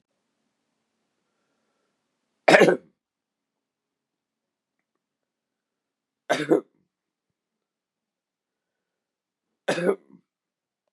{
  "three_cough_length": "10.9 s",
  "three_cough_amplitude": 32767,
  "three_cough_signal_mean_std_ratio": 0.18,
  "survey_phase": "beta (2021-08-13 to 2022-03-07)",
  "age": "45-64",
  "gender": "Male",
  "wearing_mask": "No",
  "symptom_cough_any": true,
  "symptom_sore_throat": true,
  "symptom_fatigue": true,
  "smoker_status": "Ex-smoker",
  "respiratory_condition_asthma": false,
  "respiratory_condition_other": false,
  "recruitment_source": "Test and Trace",
  "submission_delay": "1 day",
  "covid_test_result": "Positive",
  "covid_test_method": "LFT"
}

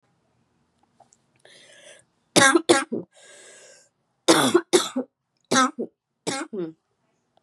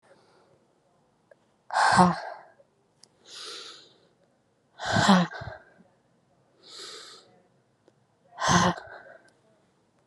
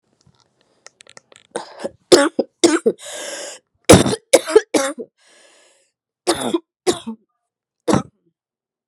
{
  "cough_length": "7.4 s",
  "cough_amplitude": 29276,
  "cough_signal_mean_std_ratio": 0.33,
  "exhalation_length": "10.1 s",
  "exhalation_amplitude": 19394,
  "exhalation_signal_mean_std_ratio": 0.31,
  "three_cough_length": "8.9 s",
  "three_cough_amplitude": 32768,
  "three_cough_signal_mean_std_ratio": 0.31,
  "survey_phase": "beta (2021-08-13 to 2022-03-07)",
  "age": "18-44",
  "gender": "Female",
  "wearing_mask": "No",
  "symptom_cough_any": true,
  "symptom_runny_or_blocked_nose": true,
  "symptom_fatigue": true,
  "symptom_fever_high_temperature": true,
  "symptom_loss_of_taste": true,
  "symptom_other": true,
  "symptom_onset": "3 days",
  "smoker_status": "Never smoked",
  "respiratory_condition_asthma": false,
  "respiratory_condition_other": false,
  "recruitment_source": "Test and Trace",
  "submission_delay": "2 days",
  "covid_test_result": "Positive",
  "covid_test_method": "RT-qPCR"
}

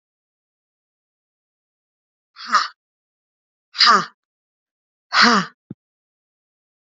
{
  "exhalation_length": "6.8 s",
  "exhalation_amplitude": 31571,
  "exhalation_signal_mean_std_ratio": 0.25,
  "survey_phase": "alpha (2021-03-01 to 2021-08-12)",
  "age": "18-44",
  "gender": "Female",
  "wearing_mask": "No",
  "symptom_none": true,
  "symptom_onset": "6 days",
  "smoker_status": "Ex-smoker",
  "respiratory_condition_asthma": false,
  "respiratory_condition_other": false,
  "recruitment_source": "REACT",
  "submission_delay": "3 days",
  "covid_test_result": "Negative",
  "covid_test_method": "RT-qPCR"
}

